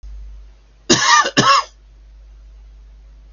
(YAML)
cough_length: 3.3 s
cough_amplitude: 32768
cough_signal_mean_std_ratio: 0.42
survey_phase: beta (2021-08-13 to 2022-03-07)
age: 65+
gender: Male
wearing_mask: 'No'
symptom_none: true
smoker_status: Never smoked
respiratory_condition_asthma: false
respiratory_condition_other: false
recruitment_source: REACT
submission_delay: 2 days
covid_test_result: Negative
covid_test_method: RT-qPCR
influenza_a_test_result: Negative
influenza_b_test_result: Negative